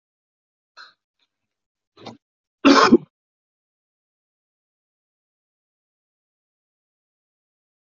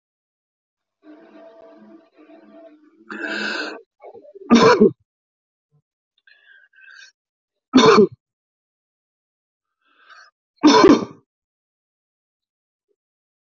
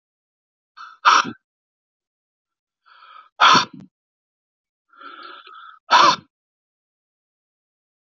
cough_length: 7.9 s
cough_amplitude: 32767
cough_signal_mean_std_ratio: 0.16
three_cough_length: 13.6 s
three_cough_amplitude: 30846
three_cough_signal_mean_std_ratio: 0.26
exhalation_length: 8.2 s
exhalation_amplitude: 25837
exhalation_signal_mean_std_ratio: 0.25
survey_phase: alpha (2021-03-01 to 2021-08-12)
age: 65+
gender: Male
wearing_mask: 'No'
symptom_none: true
smoker_status: Never smoked
respiratory_condition_asthma: false
respiratory_condition_other: false
recruitment_source: REACT
submission_delay: 2 days
covid_test_result: Negative
covid_test_method: RT-qPCR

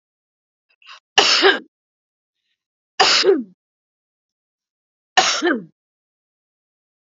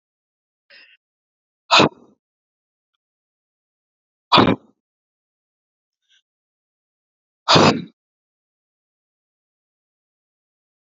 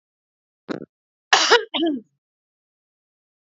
three_cough_length: 7.1 s
three_cough_amplitude: 32768
three_cough_signal_mean_std_ratio: 0.33
exhalation_length: 10.8 s
exhalation_amplitude: 30440
exhalation_signal_mean_std_ratio: 0.2
cough_length: 3.5 s
cough_amplitude: 28188
cough_signal_mean_std_ratio: 0.3
survey_phase: alpha (2021-03-01 to 2021-08-12)
age: 45-64
gender: Female
wearing_mask: 'No'
symptom_none: true
smoker_status: Ex-smoker
respiratory_condition_asthma: false
respiratory_condition_other: false
recruitment_source: REACT
submission_delay: 12 days
covid_test_result: Negative
covid_test_method: RT-qPCR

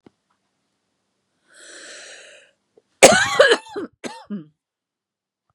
cough_length: 5.5 s
cough_amplitude: 32768
cough_signal_mean_std_ratio: 0.25
survey_phase: beta (2021-08-13 to 2022-03-07)
age: 18-44
gender: Female
wearing_mask: 'No'
symptom_cough_any: true
symptom_runny_or_blocked_nose: true
symptom_shortness_of_breath: true
symptom_fatigue: true
symptom_headache: true
symptom_onset: 2 days
smoker_status: Never smoked
respiratory_condition_asthma: true
respiratory_condition_other: false
recruitment_source: Test and Trace
submission_delay: 2 days
covid_test_result: Positive
covid_test_method: RT-qPCR
covid_ct_value: 24.3
covid_ct_gene: N gene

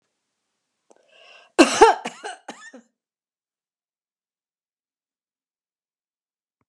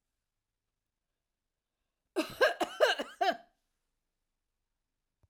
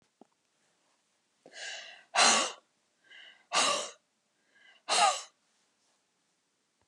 cough_length: 6.7 s
cough_amplitude: 32767
cough_signal_mean_std_ratio: 0.18
three_cough_length: 5.3 s
three_cough_amplitude: 7580
three_cough_signal_mean_std_ratio: 0.27
exhalation_length: 6.9 s
exhalation_amplitude: 10262
exhalation_signal_mean_std_ratio: 0.32
survey_phase: alpha (2021-03-01 to 2021-08-12)
age: 65+
gender: Female
wearing_mask: 'No'
symptom_none: true
smoker_status: Never smoked
respiratory_condition_asthma: false
respiratory_condition_other: true
recruitment_source: REACT
submission_delay: 2 days
covid_test_result: Negative
covid_test_method: RT-qPCR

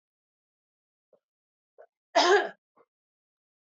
cough_length: 3.8 s
cough_amplitude: 10118
cough_signal_mean_std_ratio: 0.23
survey_phase: beta (2021-08-13 to 2022-03-07)
age: 45-64
gender: Female
wearing_mask: 'No'
symptom_cough_any: true
symptom_runny_or_blocked_nose: true
symptom_headache: true
smoker_status: Ex-smoker
respiratory_condition_asthma: false
respiratory_condition_other: false
recruitment_source: Test and Trace
submission_delay: 2 days
covid_test_result: Positive
covid_test_method: RT-qPCR
covid_ct_value: 17.9
covid_ct_gene: ORF1ab gene
covid_ct_mean: 18.6
covid_viral_load: 800000 copies/ml
covid_viral_load_category: Low viral load (10K-1M copies/ml)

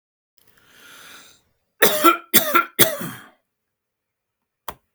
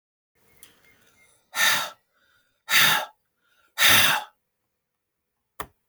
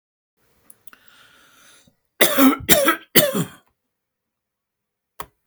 cough_length: 4.9 s
cough_amplitude: 32768
cough_signal_mean_std_ratio: 0.3
exhalation_length: 5.9 s
exhalation_amplitude: 22654
exhalation_signal_mean_std_ratio: 0.34
three_cough_length: 5.5 s
three_cough_amplitude: 32768
three_cough_signal_mean_std_ratio: 0.31
survey_phase: alpha (2021-03-01 to 2021-08-12)
age: 65+
gender: Male
wearing_mask: 'No'
symptom_none: true
smoker_status: Never smoked
respiratory_condition_asthma: false
respiratory_condition_other: false
recruitment_source: REACT
submission_delay: 3 days
covid_test_result: Negative
covid_test_method: RT-qPCR
covid_ct_value: 40.0
covid_ct_gene: N gene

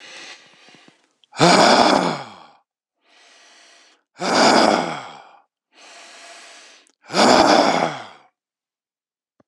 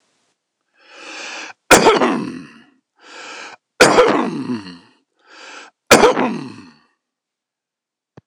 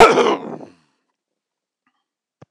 exhalation_length: 9.5 s
exhalation_amplitude: 26028
exhalation_signal_mean_std_ratio: 0.41
three_cough_length: 8.3 s
three_cough_amplitude: 26028
three_cough_signal_mean_std_ratio: 0.37
cough_length: 2.5 s
cough_amplitude: 26028
cough_signal_mean_std_ratio: 0.3
survey_phase: beta (2021-08-13 to 2022-03-07)
age: 65+
gender: Male
wearing_mask: 'No'
symptom_none: true
smoker_status: Ex-smoker
respiratory_condition_asthma: false
respiratory_condition_other: false
recruitment_source: REACT
submission_delay: 4 days
covid_test_result: Negative
covid_test_method: RT-qPCR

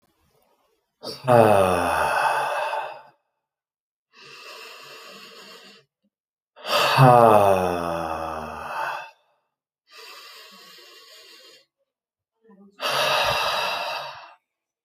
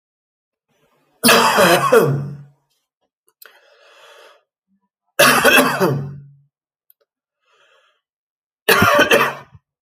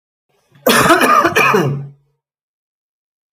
exhalation_length: 14.8 s
exhalation_amplitude: 30710
exhalation_signal_mean_std_ratio: 0.43
three_cough_length: 9.8 s
three_cough_amplitude: 32768
three_cough_signal_mean_std_ratio: 0.42
cough_length: 3.3 s
cough_amplitude: 32335
cough_signal_mean_std_ratio: 0.5
survey_phase: alpha (2021-03-01 to 2021-08-12)
age: 18-44
gender: Male
wearing_mask: 'No'
symptom_cough_any: true
smoker_status: Never smoked
respiratory_condition_asthma: false
respiratory_condition_other: false
recruitment_source: REACT
submission_delay: 1 day
covid_test_result: Negative
covid_test_method: RT-qPCR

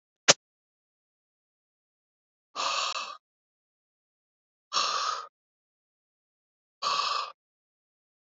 exhalation_length: 8.3 s
exhalation_amplitude: 23979
exhalation_signal_mean_std_ratio: 0.29
survey_phase: beta (2021-08-13 to 2022-03-07)
age: 18-44
gender: Male
wearing_mask: 'No'
symptom_cough_any: true
symptom_runny_or_blocked_nose: true
symptom_sore_throat: true
symptom_onset: 3 days
smoker_status: Ex-smoker
respiratory_condition_asthma: false
respiratory_condition_other: false
recruitment_source: Test and Trace
submission_delay: 1 day
covid_test_result: Positive
covid_test_method: RT-qPCR
covid_ct_value: 22.1
covid_ct_gene: ORF1ab gene
covid_ct_mean: 22.6
covid_viral_load: 38000 copies/ml
covid_viral_load_category: Low viral load (10K-1M copies/ml)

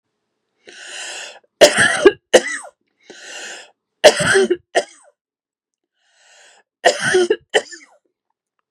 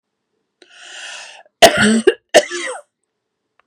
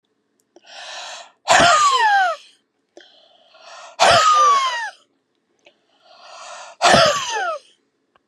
three_cough_length: 8.7 s
three_cough_amplitude: 32768
three_cough_signal_mean_std_ratio: 0.34
cough_length: 3.7 s
cough_amplitude: 32768
cough_signal_mean_std_ratio: 0.34
exhalation_length: 8.3 s
exhalation_amplitude: 31772
exhalation_signal_mean_std_ratio: 0.49
survey_phase: beta (2021-08-13 to 2022-03-07)
age: 45-64
gender: Female
wearing_mask: 'No'
symptom_none: true
smoker_status: Never smoked
respiratory_condition_asthma: false
respiratory_condition_other: false
recruitment_source: REACT
submission_delay: 3 days
covid_test_result: Negative
covid_test_method: RT-qPCR
influenza_a_test_result: Negative
influenza_b_test_result: Negative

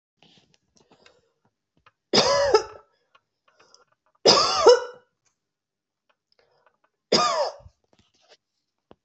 three_cough_length: 9.0 s
three_cough_amplitude: 25205
three_cough_signal_mean_std_ratio: 0.3
survey_phase: alpha (2021-03-01 to 2021-08-12)
age: 45-64
gender: Female
wearing_mask: 'No'
symptom_cough_any: true
symptom_headache: true
symptom_onset: 9 days
smoker_status: Never smoked
respiratory_condition_asthma: false
respiratory_condition_other: false
recruitment_source: Test and Trace
submission_delay: 2 days
covid_test_result: Positive
covid_test_method: RT-qPCR
covid_ct_value: 23.4
covid_ct_gene: ORF1ab gene
covid_ct_mean: 24.4
covid_viral_load: 9700 copies/ml
covid_viral_load_category: Minimal viral load (< 10K copies/ml)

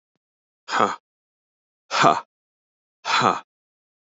exhalation_length: 4.1 s
exhalation_amplitude: 28320
exhalation_signal_mean_std_ratio: 0.32
survey_phase: beta (2021-08-13 to 2022-03-07)
age: 45-64
gender: Male
wearing_mask: 'No'
symptom_cough_any: true
symptom_runny_or_blocked_nose: true
symptom_sore_throat: true
symptom_headache: true
symptom_onset: 5 days
smoker_status: Ex-smoker
respiratory_condition_asthma: false
respiratory_condition_other: false
recruitment_source: Test and Trace
submission_delay: 1 day
covid_test_result: Positive
covid_test_method: LAMP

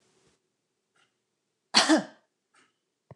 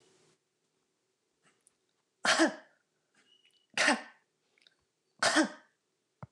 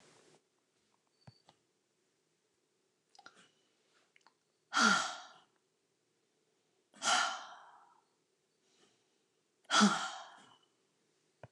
cough_length: 3.2 s
cough_amplitude: 20001
cough_signal_mean_std_ratio: 0.23
three_cough_length: 6.3 s
three_cough_amplitude: 9597
three_cough_signal_mean_std_ratio: 0.28
exhalation_length: 11.5 s
exhalation_amplitude: 5152
exhalation_signal_mean_std_ratio: 0.25
survey_phase: beta (2021-08-13 to 2022-03-07)
age: 45-64
gender: Female
wearing_mask: 'No'
symptom_none: true
smoker_status: Never smoked
respiratory_condition_asthma: false
respiratory_condition_other: false
recruitment_source: REACT
submission_delay: 4 days
covid_test_result: Negative
covid_test_method: RT-qPCR
influenza_a_test_result: Negative
influenza_b_test_result: Negative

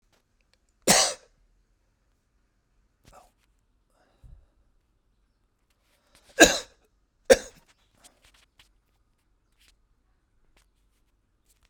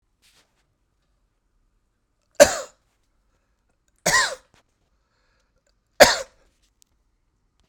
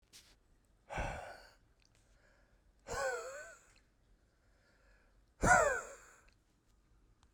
three_cough_length: 11.7 s
three_cough_amplitude: 32768
three_cough_signal_mean_std_ratio: 0.15
cough_length: 7.7 s
cough_amplitude: 32768
cough_signal_mean_std_ratio: 0.18
exhalation_length: 7.3 s
exhalation_amplitude: 6492
exhalation_signal_mean_std_ratio: 0.3
survey_phase: beta (2021-08-13 to 2022-03-07)
age: 65+
gender: Male
wearing_mask: 'No'
symptom_none: true
smoker_status: Never smoked
respiratory_condition_asthma: false
respiratory_condition_other: false
recruitment_source: REACT
submission_delay: 3 days
covid_test_result: Negative
covid_test_method: RT-qPCR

